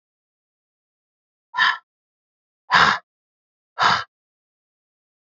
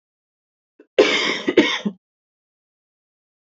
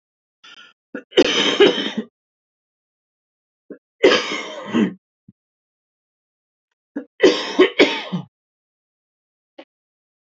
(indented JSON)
{
  "exhalation_length": "5.2 s",
  "exhalation_amplitude": 27442,
  "exhalation_signal_mean_std_ratio": 0.28,
  "cough_length": "3.4 s",
  "cough_amplitude": 27583,
  "cough_signal_mean_std_ratio": 0.34,
  "three_cough_length": "10.2 s",
  "three_cough_amplitude": 31377,
  "three_cough_signal_mean_std_ratio": 0.33,
  "survey_phase": "beta (2021-08-13 to 2022-03-07)",
  "age": "45-64",
  "gender": "Female",
  "wearing_mask": "No",
  "symptom_cough_any": true,
  "symptom_runny_or_blocked_nose": true,
  "smoker_status": "Ex-smoker",
  "respiratory_condition_asthma": false,
  "respiratory_condition_other": false,
  "recruitment_source": "REACT",
  "submission_delay": "0 days",
  "covid_test_result": "Negative",
  "covid_test_method": "RT-qPCR",
  "influenza_a_test_result": "Negative",
  "influenza_b_test_result": "Negative"
}